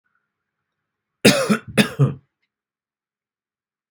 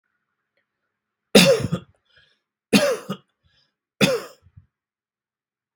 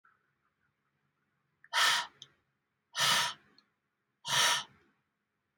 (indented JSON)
{
  "cough_length": "3.9 s",
  "cough_amplitude": 32767,
  "cough_signal_mean_std_ratio": 0.28,
  "three_cough_length": "5.8 s",
  "three_cough_amplitude": 32767,
  "three_cough_signal_mean_std_ratio": 0.28,
  "exhalation_length": "5.6 s",
  "exhalation_amplitude": 6193,
  "exhalation_signal_mean_std_ratio": 0.35,
  "survey_phase": "beta (2021-08-13 to 2022-03-07)",
  "age": "18-44",
  "gender": "Male",
  "wearing_mask": "No",
  "symptom_none": true,
  "smoker_status": "Never smoked",
  "respiratory_condition_asthma": false,
  "respiratory_condition_other": false,
  "recruitment_source": "REACT",
  "submission_delay": "4 days",
  "covid_test_result": "Negative",
  "covid_test_method": "RT-qPCR",
  "influenza_a_test_result": "Negative",
  "influenza_b_test_result": "Negative"
}